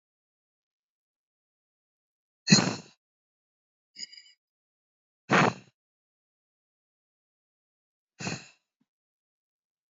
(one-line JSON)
{"exhalation_length": "9.9 s", "exhalation_amplitude": 20373, "exhalation_signal_mean_std_ratio": 0.18, "survey_phase": "beta (2021-08-13 to 2022-03-07)", "age": "45-64", "gender": "Female", "wearing_mask": "No", "symptom_runny_or_blocked_nose": true, "symptom_sore_throat": true, "smoker_status": "Never smoked", "respiratory_condition_asthma": false, "respiratory_condition_other": false, "recruitment_source": "Test and Trace", "submission_delay": "0 days", "covid_test_result": "Positive", "covid_test_method": "RT-qPCR", "covid_ct_value": 17.5, "covid_ct_gene": "ORF1ab gene", "covid_ct_mean": 18.2, "covid_viral_load": "1100000 copies/ml", "covid_viral_load_category": "High viral load (>1M copies/ml)"}